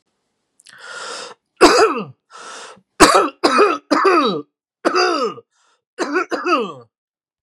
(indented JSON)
{
  "three_cough_length": "7.4 s",
  "three_cough_amplitude": 32768,
  "three_cough_signal_mean_std_ratio": 0.49,
  "survey_phase": "beta (2021-08-13 to 2022-03-07)",
  "age": "45-64",
  "gender": "Male",
  "wearing_mask": "No",
  "symptom_runny_or_blocked_nose": true,
  "smoker_status": "Never smoked",
  "respiratory_condition_asthma": false,
  "respiratory_condition_other": false,
  "recruitment_source": "REACT",
  "submission_delay": "4 days",
  "covid_test_result": "Negative",
  "covid_test_method": "RT-qPCR",
  "influenza_a_test_result": "Negative",
  "influenza_b_test_result": "Negative"
}